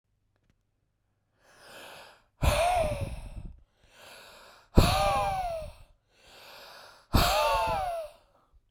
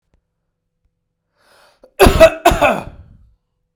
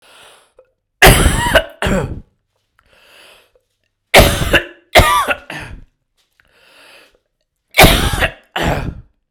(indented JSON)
{
  "exhalation_length": "8.7 s",
  "exhalation_amplitude": 22223,
  "exhalation_signal_mean_std_ratio": 0.46,
  "cough_length": "3.8 s",
  "cough_amplitude": 32768,
  "cough_signal_mean_std_ratio": 0.31,
  "three_cough_length": "9.3 s",
  "three_cough_amplitude": 32768,
  "three_cough_signal_mean_std_ratio": 0.4,
  "survey_phase": "beta (2021-08-13 to 2022-03-07)",
  "age": "18-44",
  "gender": "Male",
  "wearing_mask": "No",
  "symptom_none": true,
  "smoker_status": "Never smoked",
  "respiratory_condition_asthma": true,
  "respiratory_condition_other": false,
  "recruitment_source": "REACT",
  "submission_delay": "0 days",
  "covid_test_result": "Negative",
  "covid_test_method": "RT-qPCR"
}